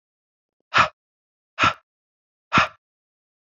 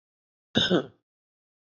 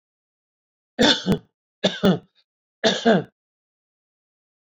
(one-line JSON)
{"exhalation_length": "3.6 s", "exhalation_amplitude": 24962, "exhalation_signal_mean_std_ratio": 0.26, "cough_length": "1.7 s", "cough_amplitude": 13152, "cough_signal_mean_std_ratio": 0.3, "three_cough_length": "4.6 s", "three_cough_amplitude": 26626, "three_cough_signal_mean_std_ratio": 0.34, "survey_phase": "alpha (2021-03-01 to 2021-08-12)", "age": "18-44", "gender": "Male", "wearing_mask": "No", "symptom_none": true, "smoker_status": "Never smoked", "respiratory_condition_asthma": false, "respiratory_condition_other": false, "recruitment_source": "REACT", "submission_delay": "3 days", "covid_test_result": "Negative", "covid_test_method": "RT-qPCR"}